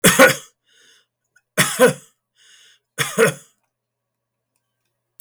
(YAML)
cough_length: 5.2 s
cough_amplitude: 32768
cough_signal_mean_std_ratio: 0.31
survey_phase: beta (2021-08-13 to 2022-03-07)
age: 65+
gender: Male
wearing_mask: 'No'
symptom_none: true
smoker_status: Never smoked
respiratory_condition_asthma: false
respiratory_condition_other: false
recruitment_source: REACT
submission_delay: 3 days
covid_test_result: Negative
covid_test_method: RT-qPCR
influenza_a_test_result: Negative
influenza_b_test_result: Negative